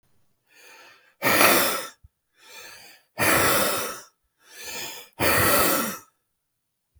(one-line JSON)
{"exhalation_length": "7.0 s", "exhalation_amplitude": 27219, "exhalation_signal_mean_std_ratio": 0.49, "survey_phase": "beta (2021-08-13 to 2022-03-07)", "age": "45-64", "gender": "Male", "wearing_mask": "No", "symptom_new_continuous_cough": true, "symptom_sore_throat": true, "symptom_fatigue": true, "symptom_loss_of_taste": true, "symptom_onset": "4 days", "smoker_status": "Never smoked", "respiratory_condition_asthma": false, "respiratory_condition_other": false, "recruitment_source": "Test and Trace", "submission_delay": "1 day", "covid_test_result": "Positive", "covid_test_method": "RT-qPCR"}